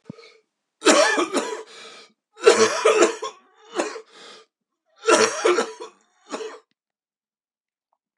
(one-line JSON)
{"three_cough_length": "8.2 s", "three_cough_amplitude": 31344, "three_cough_signal_mean_std_ratio": 0.4, "survey_phase": "beta (2021-08-13 to 2022-03-07)", "age": "65+", "gender": "Male", "wearing_mask": "No", "symptom_cough_any": true, "symptom_runny_or_blocked_nose": true, "symptom_sore_throat": true, "symptom_fever_high_temperature": true, "symptom_onset": "3 days", "smoker_status": "Ex-smoker", "respiratory_condition_asthma": false, "respiratory_condition_other": false, "recruitment_source": "Test and Trace", "submission_delay": "2 days", "covid_test_result": "Positive", "covid_test_method": "RT-qPCR", "covid_ct_value": 20.0, "covid_ct_gene": "ORF1ab gene", "covid_ct_mean": 20.1, "covid_viral_load": "250000 copies/ml", "covid_viral_load_category": "Low viral load (10K-1M copies/ml)"}